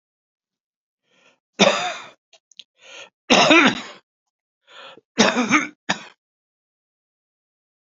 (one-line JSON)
{"three_cough_length": "7.9 s", "three_cough_amplitude": 29820, "three_cough_signal_mean_std_ratio": 0.31, "survey_phase": "beta (2021-08-13 to 2022-03-07)", "age": "18-44", "gender": "Female", "wearing_mask": "No", "symptom_cough_any": true, "symptom_runny_or_blocked_nose": true, "symptom_shortness_of_breath": true, "symptom_sore_throat": true, "symptom_diarrhoea": true, "symptom_fatigue": true, "symptom_headache": true, "smoker_status": "Ex-smoker", "respiratory_condition_asthma": false, "respiratory_condition_other": false, "recruitment_source": "Test and Trace", "submission_delay": "10 days", "covid_test_result": "Negative", "covid_test_method": "RT-qPCR"}